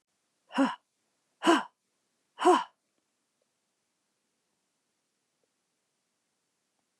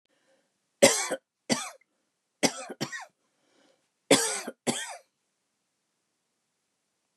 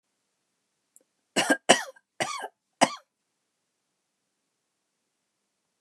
{"exhalation_length": "7.0 s", "exhalation_amplitude": 10995, "exhalation_signal_mean_std_ratio": 0.22, "three_cough_length": "7.2 s", "three_cough_amplitude": 22445, "three_cough_signal_mean_std_ratio": 0.27, "cough_length": "5.8 s", "cough_amplitude": 30331, "cough_signal_mean_std_ratio": 0.2, "survey_phase": "beta (2021-08-13 to 2022-03-07)", "age": "65+", "gender": "Female", "wearing_mask": "No", "symptom_runny_or_blocked_nose": true, "smoker_status": "Never smoked", "respiratory_condition_asthma": false, "respiratory_condition_other": false, "recruitment_source": "REACT", "submission_delay": "2 days", "covid_test_result": "Negative", "covid_test_method": "RT-qPCR", "influenza_a_test_result": "Negative", "influenza_b_test_result": "Negative"}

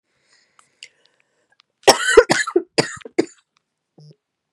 {"cough_length": "4.5 s", "cough_amplitude": 32768, "cough_signal_mean_std_ratio": 0.26, "survey_phase": "beta (2021-08-13 to 2022-03-07)", "age": "45-64", "gender": "Female", "wearing_mask": "No", "symptom_cough_any": true, "symptom_new_continuous_cough": true, "symptom_runny_or_blocked_nose": true, "symptom_change_to_sense_of_smell_or_taste": true, "symptom_loss_of_taste": true, "symptom_onset": "2 days", "smoker_status": "Never smoked", "respiratory_condition_asthma": true, "respiratory_condition_other": false, "recruitment_source": "Test and Trace", "submission_delay": "1 day", "covid_test_result": "Positive", "covid_test_method": "RT-qPCR", "covid_ct_value": 15.6, "covid_ct_gene": "ORF1ab gene", "covid_ct_mean": 16.0, "covid_viral_load": "5500000 copies/ml", "covid_viral_load_category": "High viral load (>1M copies/ml)"}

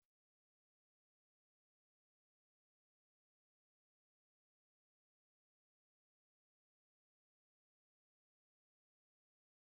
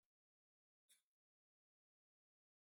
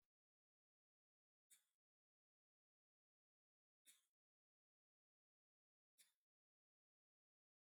{"exhalation_length": "9.7 s", "exhalation_amplitude": 2, "exhalation_signal_mean_std_ratio": 0.04, "cough_length": "2.7 s", "cough_amplitude": 42, "cough_signal_mean_std_ratio": 0.14, "three_cough_length": "7.8 s", "three_cough_amplitude": 52, "three_cough_signal_mean_std_ratio": 0.15, "survey_phase": "beta (2021-08-13 to 2022-03-07)", "age": "45-64", "gender": "Male", "wearing_mask": "No", "symptom_none": true, "smoker_status": "Never smoked", "respiratory_condition_asthma": false, "respiratory_condition_other": false, "recruitment_source": "REACT", "submission_delay": "12 days", "covid_test_result": "Negative", "covid_test_method": "RT-qPCR", "influenza_a_test_result": "Negative", "influenza_b_test_result": "Negative"}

